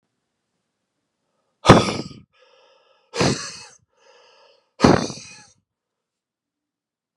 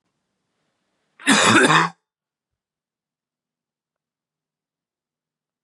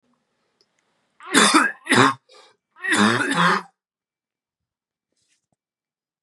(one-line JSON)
{"exhalation_length": "7.2 s", "exhalation_amplitude": 32768, "exhalation_signal_mean_std_ratio": 0.23, "cough_length": "5.6 s", "cough_amplitude": 29188, "cough_signal_mean_std_ratio": 0.26, "three_cough_length": "6.2 s", "three_cough_amplitude": 28920, "three_cough_signal_mean_std_ratio": 0.37, "survey_phase": "beta (2021-08-13 to 2022-03-07)", "age": "18-44", "gender": "Male", "wearing_mask": "No", "symptom_new_continuous_cough": true, "symptom_fatigue": true, "symptom_headache": true, "symptom_onset": "4 days", "smoker_status": "Ex-smoker", "respiratory_condition_asthma": false, "respiratory_condition_other": false, "recruitment_source": "Test and Trace", "submission_delay": "2 days", "covid_test_result": "Positive", "covid_test_method": "RT-qPCR", "covid_ct_value": 24.3, "covid_ct_gene": "N gene"}